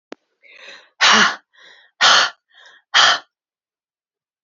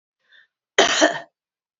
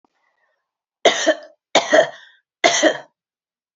{"exhalation_length": "4.4 s", "exhalation_amplitude": 31835, "exhalation_signal_mean_std_ratio": 0.36, "cough_length": "1.8 s", "cough_amplitude": 27104, "cough_signal_mean_std_ratio": 0.34, "three_cough_length": "3.8 s", "three_cough_amplitude": 32767, "three_cough_signal_mean_std_ratio": 0.37, "survey_phase": "beta (2021-08-13 to 2022-03-07)", "age": "45-64", "gender": "Female", "wearing_mask": "No", "symptom_none": true, "smoker_status": "Never smoked", "respiratory_condition_asthma": false, "respiratory_condition_other": false, "recruitment_source": "REACT", "submission_delay": "2 days", "covid_test_result": "Negative", "covid_test_method": "RT-qPCR", "influenza_a_test_result": "Negative", "influenza_b_test_result": "Negative"}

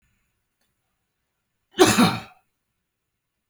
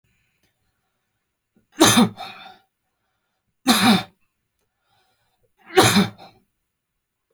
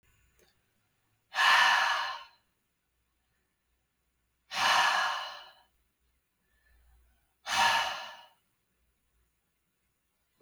{"cough_length": "3.5 s", "cough_amplitude": 27329, "cough_signal_mean_std_ratio": 0.25, "three_cough_length": "7.3 s", "three_cough_amplitude": 28700, "three_cough_signal_mean_std_ratio": 0.3, "exhalation_length": "10.4 s", "exhalation_amplitude": 8509, "exhalation_signal_mean_std_ratio": 0.36, "survey_phase": "beta (2021-08-13 to 2022-03-07)", "age": "45-64", "gender": "Male", "wearing_mask": "No", "symptom_none": true, "smoker_status": "Ex-smoker", "respiratory_condition_asthma": false, "respiratory_condition_other": false, "recruitment_source": "REACT", "submission_delay": "0 days", "covid_test_result": "Negative", "covid_test_method": "RT-qPCR"}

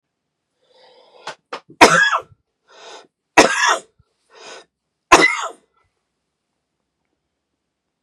{"three_cough_length": "8.0 s", "three_cough_amplitude": 32768, "three_cough_signal_mean_std_ratio": 0.27, "survey_phase": "beta (2021-08-13 to 2022-03-07)", "age": "45-64", "gender": "Male", "wearing_mask": "No", "symptom_none": true, "smoker_status": "Never smoked", "respiratory_condition_asthma": false, "respiratory_condition_other": false, "recruitment_source": "REACT", "submission_delay": "1 day", "covid_test_result": "Negative", "covid_test_method": "RT-qPCR"}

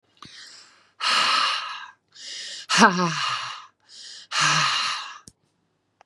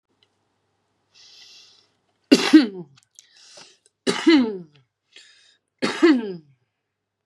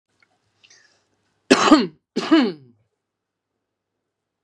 {"exhalation_length": "6.1 s", "exhalation_amplitude": 30787, "exhalation_signal_mean_std_ratio": 0.51, "three_cough_length": "7.3 s", "three_cough_amplitude": 32751, "three_cough_signal_mean_std_ratio": 0.3, "cough_length": "4.4 s", "cough_amplitude": 32767, "cough_signal_mean_std_ratio": 0.29, "survey_phase": "beta (2021-08-13 to 2022-03-07)", "age": "45-64", "gender": "Female", "wearing_mask": "No", "symptom_none": true, "smoker_status": "Current smoker (1 to 10 cigarettes per day)", "respiratory_condition_asthma": false, "respiratory_condition_other": false, "recruitment_source": "REACT", "submission_delay": "1 day", "covid_test_result": "Negative", "covid_test_method": "RT-qPCR", "influenza_a_test_result": "Unknown/Void", "influenza_b_test_result": "Unknown/Void"}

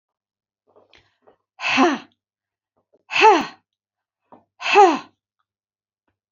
{"exhalation_length": "6.3 s", "exhalation_amplitude": 27931, "exhalation_signal_mean_std_ratio": 0.3, "survey_phase": "beta (2021-08-13 to 2022-03-07)", "age": "65+", "gender": "Female", "wearing_mask": "No", "symptom_none": true, "smoker_status": "Never smoked", "respiratory_condition_asthma": false, "respiratory_condition_other": false, "recruitment_source": "REACT", "submission_delay": "1 day", "covid_test_result": "Negative", "covid_test_method": "RT-qPCR", "influenza_a_test_result": "Unknown/Void", "influenza_b_test_result": "Unknown/Void"}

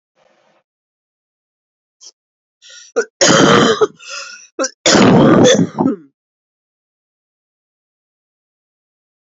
{"cough_length": "9.3 s", "cough_amplitude": 32768, "cough_signal_mean_std_ratio": 0.38, "survey_phase": "alpha (2021-03-01 to 2021-08-12)", "age": "45-64", "gender": "Female", "wearing_mask": "No", "symptom_new_continuous_cough": true, "symptom_shortness_of_breath": true, "symptom_fatigue": true, "symptom_fever_high_temperature": true, "symptom_headache": true, "symptom_onset": "3 days", "smoker_status": "Ex-smoker", "respiratory_condition_asthma": false, "respiratory_condition_other": false, "recruitment_source": "Test and Trace", "submission_delay": "2 days", "covid_test_result": "Positive", "covid_test_method": "RT-qPCR"}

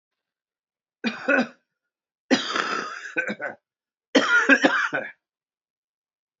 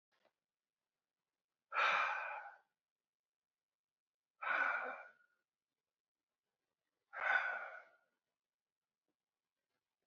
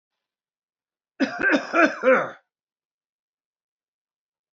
{"three_cough_length": "6.4 s", "three_cough_amplitude": 21551, "three_cough_signal_mean_std_ratio": 0.41, "exhalation_length": "10.1 s", "exhalation_amplitude": 2648, "exhalation_signal_mean_std_ratio": 0.33, "cough_length": "4.5 s", "cough_amplitude": 26048, "cough_signal_mean_std_ratio": 0.32, "survey_phase": "alpha (2021-03-01 to 2021-08-12)", "age": "45-64", "gender": "Male", "wearing_mask": "No", "symptom_cough_any": true, "symptom_fatigue": true, "symptom_fever_high_temperature": true, "symptom_headache": true, "smoker_status": "Never smoked", "respiratory_condition_asthma": false, "respiratory_condition_other": false, "recruitment_source": "Test and Trace", "submission_delay": "1 day", "covid_test_result": "Positive", "covid_test_method": "RT-qPCR", "covid_ct_value": 16.1, "covid_ct_gene": "ORF1ab gene", "covid_ct_mean": 16.5, "covid_viral_load": "3800000 copies/ml", "covid_viral_load_category": "High viral load (>1M copies/ml)"}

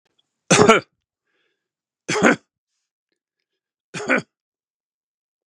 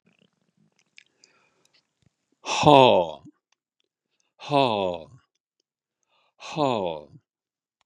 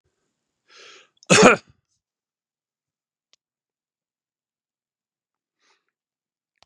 {"three_cough_length": "5.5 s", "three_cough_amplitude": 32768, "three_cough_signal_mean_std_ratio": 0.27, "exhalation_length": "7.9 s", "exhalation_amplitude": 30924, "exhalation_signal_mean_std_ratio": 0.26, "cough_length": "6.7 s", "cough_amplitude": 32767, "cough_signal_mean_std_ratio": 0.16, "survey_phase": "beta (2021-08-13 to 2022-03-07)", "age": "65+", "gender": "Male", "wearing_mask": "No", "symptom_none": true, "smoker_status": "Ex-smoker", "respiratory_condition_asthma": false, "respiratory_condition_other": false, "recruitment_source": "REACT", "submission_delay": "4 days", "covid_test_result": "Negative", "covid_test_method": "RT-qPCR", "influenza_a_test_result": "Unknown/Void", "influenza_b_test_result": "Unknown/Void"}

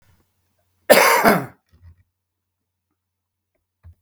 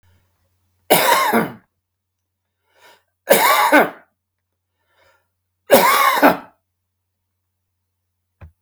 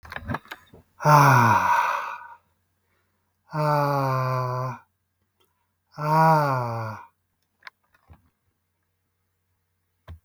{"cough_length": "4.0 s", "cough_amplitude": 32768, "cough_signal_mean_std_ratio": 0.28, "three_cough_length": "8.6 s", "three_cough_amplitude": 32768, "three_cough_signal_mean_std_ratio": 0.37, "exhalation_length": "10.2 s", "exhalation_amplitude": 26973, "exhalation_signal_mean_std_ratio": 0.44, "survey_phase": "beta (2021-08-13 to 2022-03-07)", "age": "45-64", "gender": "Male", "wearing_mask": "No", "symptom_none": true, "smoker_status": "Current smoker (11 or more cigarettes per day)", "respiratory_condition_asthma": false, "respiratory_condition_other": false, "recruitment_source": "REACT", "submission_delay": "1 day", "covid_test_result": "Negative", "covid_test_method": "RT-qPCR"}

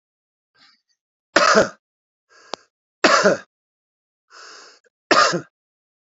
{"three_cough_length": "6.1 s", "three_cough_amplitude": 29774, "three_cough_signal_mean_std_ratio": 0.31, "survey_phase": "beta (2021-08-13 to 2022-03-07)", "age": "45-64", "gender": "Male", "wearing_mask": "No", "symptom_runny_or_blocked_nose": true, "symptom_onset": "3 days", "smoker_status": "Current smoker (1 to 10 cigarettes per day)", "respiratory_condition_asthma": false, "respiratory_condition_other": false, "recruitment_source": "Test and Trace", "submission_delay": "0 days", "covid_test_result": "Positive", "covid_test_method": "RT-qPCR"}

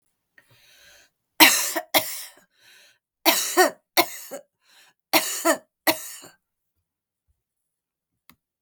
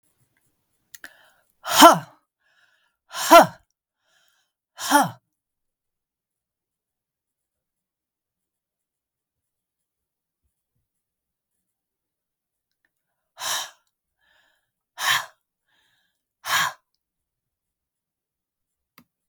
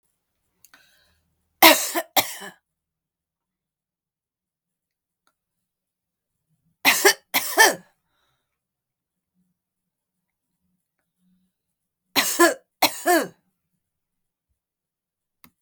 {"cough_length": "8.6 s", "cough_amplitude": 32768, "cough_signal_mean_std_ratio": 0.31, "exhalation_length": "19.3 s", "exhalation_amplitude": 32768, "exhalation_signal_mean_std_ratio": 0.17, "three_cough_length": "15.6 s", "three_cough_amplitude": 32768, "three_cough_signal_mean_std_ratio": 0.23, "survey_phase": "beta (2021-08-13 to 2022-03-07)", "age": "65+", "gender": "Female", "wearing_mask": "No", "symptom_none": true, "smoker_status": "Ex-smoker", "respiratory_condition_asthma": false, "respiratory_condition_other": false, "recruitment_source": "REACT", "submission_delay": "0 days", "covid_test_result": "Negative", "covid_test_method": "RT-qPCR"}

